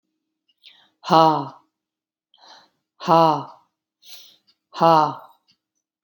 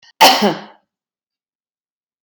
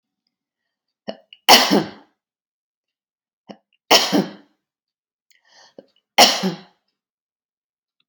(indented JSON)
{
  "exhalation_length": "6.0 s",
  "exhalation_amplitude": 28793,
  "exhalation_signal_mean_std_ratio": 0.3,
  "cough_length": "2.2 s",
  "cough_amplitude": 32768,
  "cough_signal_mean_std_ratio": 0.3,
  "three_cough_length": "8.1 s",
  "three_cough_amplitude": 32768,
  "three_cough_signal_mean_std_ratio": 0.26,
  "survey_phase": "alpha (2021-03-01 to 2021-08-12)",
  "age": "45-64",
  "gender": "Female",
  "wearing_mask": "No",
  "symptom_none": true,
  "smoker_status": "Ex-smoker",
  "respiratory_condition_asthma": false,
  "respiratory_condition_other": false,
  "recruitment_source": "REACT",
  "submission_delay": "2 days",
  "covid_test_result": "Negative",
  "covid_test_method": "RT-qPCR"
}